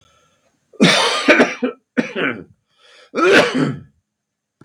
{"cough_length": "4.6 s", "cough_amplitude": 32768, "cough_signal_mean_std_ratio": 0.48, "survey_phase": "beta (2021-08-13 to 2022-03-07)", "age": "45-64", "gender": "Male", "wearing_mask": "No", "symptom_cough_any": true, "symptom_sore_throat": true, "smoker_status": "Ex-smoker", "respiratory_condition_asthma": false, "respiratory_condition_other": false, "recruitment_source": "Test and Trace", "submission_delay": "1 day", "covid_test_result": "Positive", "covid_test_method": "LFT"}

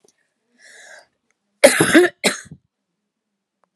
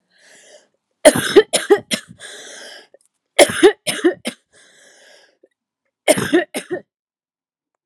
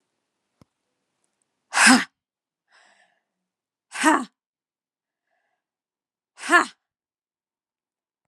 {"cough_length": "3.8 s", "cough_amplitude": 32768, "cough_signal_mean_std_ratio": 0.28, "three_cough_length": "7.9 s", "three_cough_amplitude": 32768, "three_cough_signal_mean_std_ratio": 0.31, "exhalation_length": "8.3 s", "exhalation_amplitude": 28675, "exhalation_signal_mean_std_ratio": 0.21, "survey_phase": "alpha (2021-03-01 to 2021-08-12)", "age": "45-64", "gender": "Female", "wearing_mask": "No", "symptom_cough_any": true, "symptom_onset": "3 days", "smoker_status": "Never smoked", "respiratory_condition_asthma": false, "respiratory_condition_other": false, "recruitment_source": "Test and Trace", "submission_delay": "2 days", "covid_test_result": "Positive", "covid_test_method": "RT-qPCR", "covid_ct_value": 18.0, "covid_ct_gene": "N gene", "covid_ct_mean": 18.0, "covid_viral_load": "1200000 copies/ml", "covid_viral_load_category": "High viral load (>1M copies/ml)"}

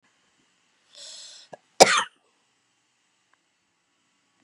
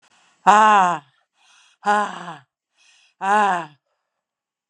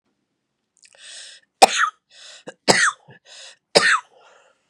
{"cough_length": "4.4 s", "cough_amplitude": 32768, "cough_signal_mean_std_ratio": 0.16, "exhalation_length": "4.7 s", "exhalation_amplitude": 32580, "exhalation_signal_mean_std_ratio": 0.36, "three_cough_length": "4.7 s", "three_cough_amplitude": 32768, "three_cough_signal_mean_std_ratio": 0.3, "survey_phase": "beta (2021-08-13 to 2022-03-07)", "age": "45-64", "gender": "Female", "wearing_mask": "No", "symptom_none": true, "smoker_status": "Current smoker (11 or more cigarettes per day)", "respiratory_condition_asthma": false, "respiratory_condition_other": true, "recruitment_source": "REACT", "submission_delay": "0 days", "covid_test_result": "Negative", "covid_test_method": "RT-qPCR"}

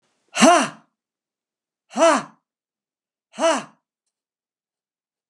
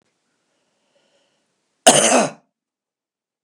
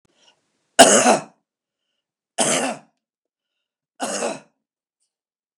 {"exhalation_length": "5.3 s", "exhalation_amplitude": 32248, "exhalation_signal_mean_std_ratio": 0.29, "cough_length": "3.4 s", "cough_amplitude": 32768, "cough_signal_mean_std_ratio": 0.26, "three_cough_length": "5.6 s", "three_cough_amplitude": 32768, "three_cough_signal_mean_std_ratio": 0.29, "survey_phase": "beta (2021-08-13 to 2022-03-07)", "age": "65+", "gender": "Male", "wearing_mask": "No", "symptom_cough_any": true, "symptom_runny_or_blocked_nose": true, "symptom_headache": true, "symptom_onset": "12 days", "smoker_status": "Never smoked", "respiratory_condition_asthma": false, "respiratory_condition_other": false, "recruitment_source": "REACT", "submission_delay": "2 days", "covid_test_result": "Negative", "covid_test_method": "RT-qPCR"}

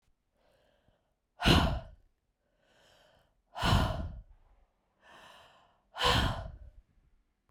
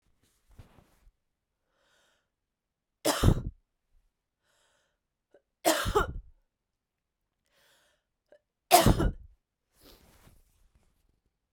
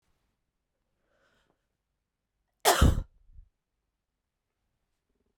{"exhalation_length": "7.5 s", "exhalation_amplitude": 13136, "exhalation_signal_mean_std_ratio": 0.34, "three_cough_length": "11.5 s", "three_cough_amplitude": 18501, "three_cough_signal_mean_std_ratio": 0.23, "cough_length": "5.4 s", "cough_amplitude": 13336, "cough_signal_mean_std_ratio": 0.2, "survey_phase": "beta (2021-08-13 to 2022-03-07)", "age": "45-64", "gender": "Female", "wearing_mask": "Prefer not to say", "symptom_cough_any": true, "symptom_shortness_of_breath": true, "symptom_sore_throat": true, "symptom_fatigue": true, "symptom_fever_high_temperature": true, "symptom_headache": true, "symptom_change_to_sense_of_smell_or_taste": true, "symptom_loss_of_taste": true, "symptom_onset": "5 days", "smoker_status": "Never smoked", "respiratory_condition_asthma": false, "respiratory_condition_other": false, "recruitment_source": "Test and Trace", "submission_delay": "3 days", "covid_test_result": "Positive", "covid_test_method": "RT-qPCR", "covid_ct_value": 23.9, "covid_ct_gene": "ORF1ab gene"}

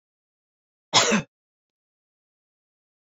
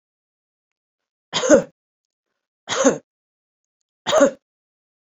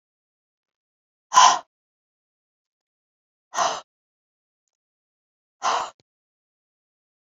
{"cough_length": "3.1 s", "cough_amplitude": 22224, "cough_signal_mean_std_ratio": 0.23, "three_cough_length": "5.1 s", "three_cough_amplitude": 27769, "three_cough_signal_mean_std_ratio": 0.28, "exhalation_length": "7.3 s", "exhalation_amplitude": 28299, "exhalation_signal_mean_std_ratio": 0.21, "survey_phase": "beta (2021-08-13 to 2022-03-07)", "age": "45-64", "gender": "Female", "wearing_mask": "No", "symptom_runny_or_blocked_nose": true, "symptom_fatigue": true, "symptom_headache": true, "symptom_onset": "6 days", "smoker_status": "Never smoked", "respiratory_condition_asthma": false, "respiratory_condition_other": false, "recruitment_source": "REACT", "submission_delay": "3 days", "covid_test_result": "Negative", "covid_test_method": "RT-qPCR"}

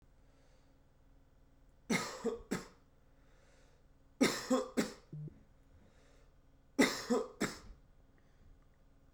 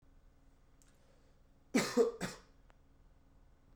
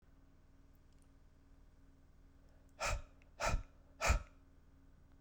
{"three_cough_length": "9.1 s", "three_cough_amplitude": 5629, "three_cough_signal_mean_std_ratio": 0.35, "cough_length": "3.8 s", "cough_amplitude": 4032, "cough_signal_mean_std_ratio": 0.3, "exhalation_length": "5.2 s", "exhalation_amplitude": 3519, "exhalation_signal_mean_std_ratio": 0.35, "survey_phase": "beta (2021-08-13 to 2022-03-07)", "age": "18-44", "gender": "Male", "wearing_mask": "No", "symptom_cough_any": true, "symptom_runny_or_blocked_nose": true, "symptom_sore_throat": true, "symptom_fatigue": true, "symptom_headache": true, "symptom_change_to_sense_of_smell_or_taste": true, "symptom_loss_of_taste": true, "symptom_onset": "3 days", "smoker_status": "Never smoked", "respiratory_condition_asthma": false, "respiratory_condition_other": false, "recruitment_source": "Test and Trace", "submission_delay": "1 day", "covid_test_result": "Positive", "covid_test_method": "RT-qPCR", "covid_ct_value": 19.8, "covid_ct_gene": "ORF1ab gene", "covid_ct_mean": 20.0, "covid_viral_load": "270000 copies/ml", "covid_viral_load_category": "Low viral load (10K-1M copies/ml)"}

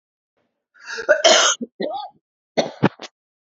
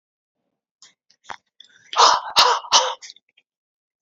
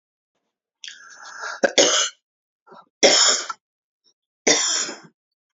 {"cough_length": "3.6 s", "cough_amplitude": 31150, "cough_signal_mean_std_ratio": 0.38, "exhalation_length": "4.0 s", "exhalation_amplitude": 32767, "exhalation_signal_mean_std_ratio": 0.33, "three_cough_length": "5.5 s", "three_cough_amplitude": 28616, "three_cough_signal_mean_std_ratio": 0.38, "survey_phase": "beta (2021-08-13 to 2022-03-07)", "age": "45-64", "gender": "Female", "wearing_mask": "No", "symptom_none": true, "smoker_status": "Ex-smoker", "respiratory_condition_asthma": true, "respiratory_condition_other": false, "recruitment_source": "REACT", "submission_delay": "1 day", "covid_test_result": "Negative", "covid_test_method": "RT-qPCR", "influenza_a_test_result": "Negative", "influenza_b_test_result": "Negative"}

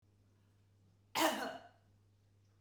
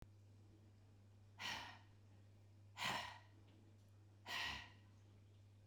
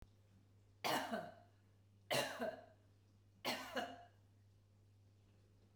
{"cough_length": "2.6 s", "cough_amplitude": 3881, "cough_signal_mean_std_ratio": 0.32, "exhalation_length": "5.7 s", "exhalation_amplitude": 905, "exhalation_signal_mean_std_ratio": 0.56, "three_cough_length": "5.8 s", "three_cough_amplitude": 1708, "three_cough_signal_mean_std_ratio": 0.44, "survey_phase": "beta (2021-08-13 to 2022-03-07)", "age": "45-64", "gender": "Female", "wearing_mask": "No", "symptom_none": true, "smoker_status": "Never smoked", "respiratory_condition_asthma": false, "respiratory_condition_other": false, "recruitment_source": "REACT", "submission_delay": "2 days", "covid_test_result": "Negative", "covid_test_method": "RT-qPCR"}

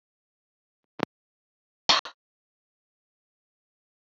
{"cough_length": "4.0 s", "cough_amplitude": 18216, "cough_signal_mean_std_ratio": 0.13, "survey_phase": "beta (2021-08-13 to 2022-03-07)", "age": "45-64", "gender": "Female", "wearing_mask": "No", "symptom_fatigue": true, "smoker_status": "Never smoked", "respiratory_condition_asthma": false, "respiratory_condition_other": false, "recruitment_source": "REACT", "submission_delay": "1 day", "covid_test_result": "Negative", "covid_test_method": "RT-qPCR", "influenza_a_test_result": "Negative", "influenza_b_test_result": "Negative"}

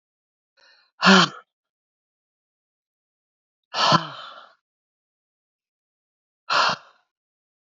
{"exhalation_length": "7.7 s", "exhalation_amplitude": 27951, "exhalation_signal_mean_std_ratio": 0.25, "survey_phase": "beta (2021-08-13 to 2022-03-07)", "age": "65+", "gender": "Female", "wearing_mask": "No", "symptom_none": true, "smoker_status": "Current smoker (11 or more cigarettes per day)", "respiratory_condition_asthma": false, "respiratory_condition_other": false, "recruitment_source": "REACT", "submission_delay": "0 days", "covid_test_result": "Negative", "covid_test_method": "RT-qPCR", "influenza_a_test_result": "Negative", "influenza_b_test_result": "Negative"}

